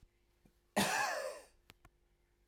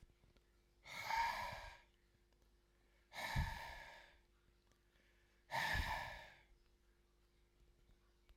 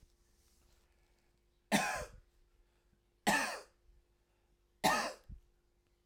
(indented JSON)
{
  "cough_length": "2.5 s",
  "cough_amplitude": 3441,
  "cough_signal_mean_std_ratio": 0.41,
  "exhalation_length": "8.4 s",
  "exhalation_amplitude": 1261,
  "exhalation_signal_mean_std_ratio": 0.43,
  "three_cough_length": "6.1 s",
  "three_cough_amplitude": 4992,
  "three_cough_signal_mean_std_ratio": 0.32,
  "survey_phase": "alpha (2021-03-01 to 2021-08-12)",
  "age": "45-64",
  "gender": "Male",
  "wearing_mask": "No",
  "symptom_none": true,
  "smoker_status": "Never smoked",
  "respiratory_condition_asthma": false,
  "respiratory_condition_other": false,
  "recruitment_source": "REACT",
  "submission_delay": "1 day",
  "covid_test_result": "Negative",
  "covid_test_method": "RT-qPCR"
}